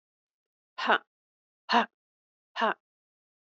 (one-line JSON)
{"exhalation_length": "3.4 s", "exhalation_amplitude": 12131, "exhalation_signal_mean_std_ratio": 0.26, "survey_phase": "beta (2021-08-13 to 2022-03-07)", "age": "45-64", "gender": "Female", "wearing_mask": "No", "symptom_cough_any": true, "symptom_sore_throat": true, "symptom_onset": "12 days", "smoker_status": "Never smoked", "respiratory_condition_asthma": false, "respiratory_condition_other": false, "recruitment_source": "REACT", "submission_delay": "3 days", "covid_test_result": "Negative", "covid_test_method": "RT-qPCR", "covid_ct_value": 38.0, "covid_ct_gene": "N gene", "influenza_a_test_result": "Negative", "influenza_b_test_result": "Negative"}